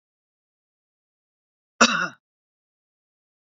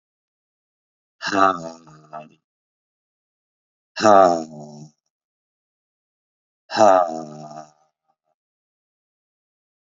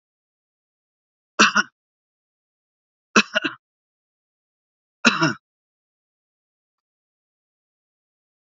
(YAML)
cough_length: 3.6 s
cough_amplitude: 26805
cough_signal_mean_std_ratio: 0.18
exhalation_length: 10.0 s
exhalation_amplitude: 27550
exhalation_signal_mean_std_ratio: 0.26
three_cough_length: 8.5 s
three_cough_amplitude: 30861
three_cough_signal_mean_std_ratio: 0.19
survey_phase: beta (2021-08-13 to 2022-03-07)
age: 45-64
gender: Male
wearing_mask: 'No'
symptom_none: true
smoker_status: Ex-smoker
respiratory_condition_asthma: false
respiratory_condition_other: false
recruitment_source: REACT
submission_delay: 11 days
covid_test_result: Negative
covid_test_method: RT-qPCR